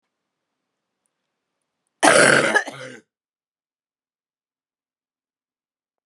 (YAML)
cough_length: 6.1 s
cough_amplitude: 31510
cough_signal_mean_std_ratio: 0.25
survey_phase: beta (2021-08-13 to 2022-03-07)
age: 45-64
gender: Female
wearing_mask: 'No'
symptom_cough_any: true
symptom_new_continuous_cough: true
symptom_runny_or_blocked_nose: true
symptom_sore_throat: true
symptom_abdominal_pain: true
symptom_fatigue: true
symptom_headache: true
symptom_other: true
symptom_onset: 3 days
smoker_status: Never smoked
respiratory_condition_asthma: false
respiratory_condition_other: false
recruitment_source: Test and Trace
submission_delay: 1 day
covid_test_result: Positive
covid_test_method: RT-qPCR